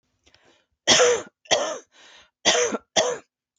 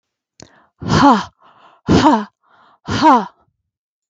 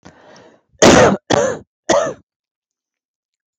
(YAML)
three_cough_length: 3.6 s
three_cough_amplitude: 31444
three_cough_signal_mean_std_ratio: 0.44
exhalation_length: 4.1 s
exhalation_amplitude: 32768
exhalation_signal_mean_std_ratio: 0.42
cough_length: 3.6 s
cough_amplitude: 32768
cough_signal_mean_std_ratio: 0.38
survey_phase: beta (2021-08-13 to 2022-03-07)
age: 45-64
gender: Female
wearing_mask: 'No'
symptom_cough_any: true
symptom_runny_or_blocked_nose: true
symptom_onset: 5 days
smoker_status: Never smoked
respiratory_condition_asthma: false
respiratory_condition_other: false
recruitment_source: REACT
submission_delay: 1 day
covid_test_result: Negative
covid_test_method: RT-qPCR
influenza_a_test_result: Negative
influenza_b_test_result: Negative